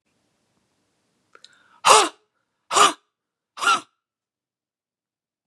{
  "exhalation_length": "5.5 s",
  "exhalation_amplitude": 32683,
  "exhalation_signal_mean_std_ratio": 0.25,
  "survey_phase": "beta (2021-08-13 to 2022-03-07)",
  "age": "18-44",
  "gender": "Female",
  "wearing_mask": "No",
  "symptom_none": true,
  "smoker_status": "Never smoked",
  "respiratory_condition_asthma": true,
  "respiratory_condition_other": false,
  "recruitment_source": "REACT",
  "submission_delay": "1 day",
  "covid_test_result": "Negative",
  "covid_test_method": "RT-qPCR",
  "influenza_a_test_result": "Unknown/Void",
  "influenza_b_test_result": "Unknown/Void"
}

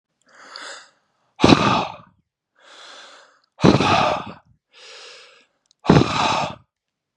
{
  "exhalation_length": "7.2 s",
  "exhalation_amplitude": 32768,
  "exhalation_signal_mean_std_ratio": 0.37,
  "survey_phase": "beta (2021-08-13 to 2022-03-07)",
  "age": "18-44",
  "gender": "Male",
  "wearing_mask": "No",
  "symptom_none": true,
  "smoker_status": "Current smoker (1 to 10 cigarettes per day)",
  "respiratory_condition_asthma": false,
  "respiratory_condition_other": false,
  "recruitment_source": "REACT",
  "submission_delay": "1 day",
  "covid_test_result": "Negative",
  "covid_test_method": "RT-qPCR",
  "influenza_a_test_result": "Negative",
  "influenza_b_test_result": "Negative"
}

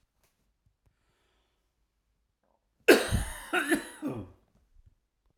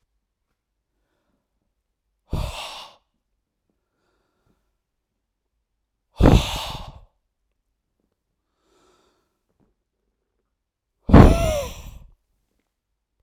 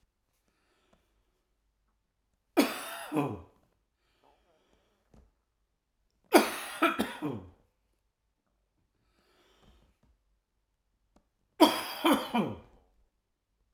{
  "cough_length": "5.4 s",
  "cough_amplitude": 19525,
  "cough_signal_mean_std_ratio": 0.27,
  "exhalation_length": "13.2 s",
  "exhalation_amplitude": 32768,
  "exhalation_signal_mean_std_ratio": 0.2,
  "three_cough_length": "13.7 s",
  "three_cough_amplitude": 17572,
  "three_cough_signal_mean_std_ratio": 0.26,
  "survey_phase": "alpha (2021-03-01 to 2021-08-12)",
  "age": "45-64",
  "gender": "Male",
  "wearing_mask": "No",
  "symptom_cough_any": true,
  "symptom_fatigue": true,
  "symptom_fever_high_temperature": true,
  "symptom_headache": true,
  "symptom_change_to_sense_of_smell_or_taste": true,
  "symptom_loss_of_taste": true,
  "smoker_status": "Never smoked",
  "respiratory_condition_asthma": false,
  "respiratory_condition_other": false,
  "recruitment_source": "Test and Trace",
  "submission_delay": "2 days",
  "covid_test_result": "Positive",
  "covid_test_method": "RT-qPCR",
  "covid_ct_value": 18.2,
  "covid_ct_gene": "ORF1ab gene",
  "covid_ct_mean": 19.2,
  "covid_viral_load": "500000 copies/ml",
  "covid_viral_load_category": "Low viral load (10K-1M copies/ml)"
}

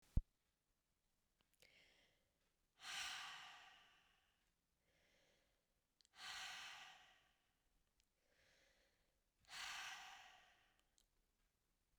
{
  "exhalation_length": "12.0 s",
  "exhalation_amplitude": 1969,
  "exhalation_signal_mean_std_ratio": 0.29,
  "survey_phase": "beta (2021-08-13 to 2022-03-07)",
  "age": "18-44",
  "gender": "Female",
  "wearing_mask": "No",
  "symptom_runny_or_blocked_nose": true,
  "symptom_change_to_sense_of_smell_or_taste": true,
  "symptom_other": true,
  "symptom_onset": "4 days",
  "smoker_status": "Never smoked",
  "respiratory_condition_asthma": false,
  "respiratory_condition_other": false,
  "recruitment_source": "Test and Trace",
  "submission_delay": "2 days",
  "covid_test_result": "Positive",
  "covid_test_method": "RT-qPCR",
  "covid_ct_value": 18.0,
  "covid_ct_gene": "ORF1ab gene",
  "covid_ct_mean": 18.8,
  "covid_viral_load": "680000 copies/ml",
  "covid_viral_load_category": "Low viral load (10K-1M copies/ml)"
}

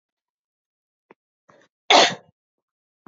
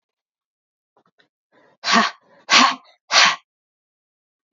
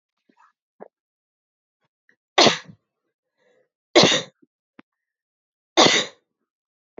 {
  "cough_length": "3.1 s",
  "cough_amplitude": 28252,
  "cough_signal_mean_std_ratio": 0.21,
  "exhalation_length": "4.5 s",
  "exhalation_amplitude": 32277,
  "exhalation_signal_mean_std_ratio": 0.31,
  "three_cough_length": "7.0 s",
  "three_cough_amplitude": 32767,
  "three_cough_signal_mean_std_ratio": 0.24,
  "survey_phase": "alpha (2021-03-01 to 2021-08-12)",
  "age": "18-44",
  "gender": "Female",
  "wearing_mask": "No",
  "symptom_headache": true,
  "smoker_status": "Never smoked",
  "respiratory_condition_asthma": false,
  "respiratory_condition_other": false,
  "recruitment_source": "REACT",
  "submission_delay": "1 day",
  "covid_test_result": "Negative",
  "covid_test_method": "RT-qPCR"
}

